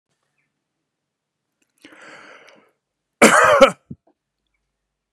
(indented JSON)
{
  "cough_length": "5.1 s",
  "cough_amplitude": 32768,
  "cough_signal_mean_std_ratio": 0.24,
  "survey_phase": "beta (2021-08-13 to 2022-03-07)",
  "age": "45-64",
  "gender": "Male",
  "wearing_mask": "No",
  "symptom_none": true,
  "smoker_status": "Never smoked",
  "respiratory_condition_asthma": true,
  "respiratory_condition_other": false,
  "recruitment_source": "REACT",
  "submission_delay": "1 day",
  "covid_test_result": "Negative",
  "covid_test_method": "RT-qPCR",
  "influenza_a_test_result": "Negative",
  "influenza_b_test_result": "Negative"
}